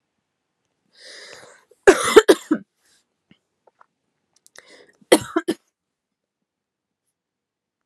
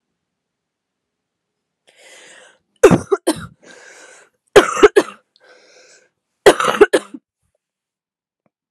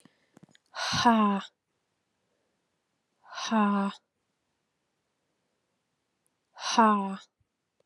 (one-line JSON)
{"cough_length": "7.9 s", "cough_amplitude": 32768, "cough_signal_mean_std_ratio": 0.19, "three_cough_length": "8.7 s", "three_cough_amplitude": 32768, "three_cough_signal_mean_std_ratio": 0.24, "exhalation_length": "7.9 s", "exhalation_amplitude": 13527, "exhalation_signal_mean_std_ratio": 0.35, "survey_phase": "alpha (2021-03-01 to 2021-08-12)", "age": "18-44", "gender": "Female", "wearing_mask": "No", "symptom_cough_any": true, "symptom_new_continuous_cough": true, "symptom_fatigue": true, "symptom_fever_high_temperature": true, "symptom_headache": true, "symptom_change_to_sense_of_smell_or_taste": true, "symptom_onset": "3 days", "smoker_status": "Never smoked", "respiratory_condition_asthma": false, "respiratory_condition_other": false, "recruitment_source": "Test and Trace", "submission_delay": "2 days", "covid_test_result": "Positive", "covid_test_method": "RT-qPCR", "covid_ct_value": 17.5, "covid_ct_gene": "ORF1ab gene", "covid_ct_mean": 17.6, "covid_viral_load": "1600000 copies/ml", "covid_viral_load_category": "High viral load (>1M copies/ml)"}